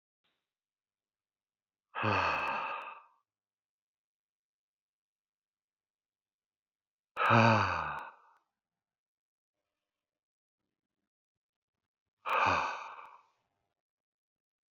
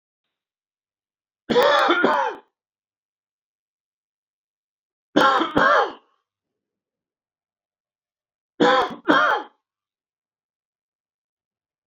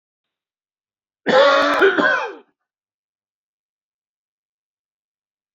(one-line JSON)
{"exhalation_length": "14.8 s", "exhalation_amplitude": 9455, "exhalation_signal_mean_std_ratio": 0.29, "three_cough_length": "11.9 s", "three_cough_amplitude": 25407, "three_cough_signal_mean_std_ratio": 0.34, "cough_length": "5.5 s", "cough_amplitude": 25141, "cough_signal_mean_std_ratio": 0.35, "survey_phase": "beta (2021-08-13 to 2022-03-07)", "age": "45-64", "gender": "Male", "wearing_mask": "No", "symptom_runny_or_blocked_nose": true, "symptom_sore_throat": true, "symptom_diarrhoea": true, "symptom_loss_of_taste": true, "symptom_onset": "4 days", "smoker_status": "Ex-smoker", "respiratory_condition_asthma": false, "respiratory_condition_other": false, "recruitment_source": "Test and Trace", "submission_delay": "1 day", "covid_test_result": "Positive", "covid_test_method": "RT-qPCR", "covid_ct_value": 19.4, "covid_ct_gene": "ORF1ab gene", "covid_ct_mean": 19.7, "covid_viral_load": "350000 copies/ml", "covid_viral_load_category": "Low viral load (10K-1M copies/ml)"}